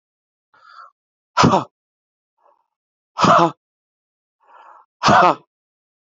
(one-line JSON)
{"exhalation_length": "6.1 s", "exhalation_amplitude": 32490, "exhalation_signal_mean_std_ratio": 0.3, "survey_phase": "alpha (2021-03-01 to 2021-08-12)", "age": "18-44", "gender": "Male", "wearing_mask": "No", "symptom_cough_any": true, "symptom_new_continuous_cough": true, "symptom_fatigue": true, "symptom_headache": true, "smoker_status": "Ex-smoker", "respiratory_condition_asthma": true, "respiratory_condition_other": false, "recruitment_source": "Test and Trace", "submission_delay": "1 day", "covid_test_result": "Positive", "covid_test_method": "RT-qPCR", "covid_ct_value": 19.1, "covid_ct_gene": "ORF1ab gene", "covid_ct_mean": 20.3, "covid_viral_load": "220000 copies/ml", "covid_viral_load_category": "Low viral load (10K-1M copies/ml)"}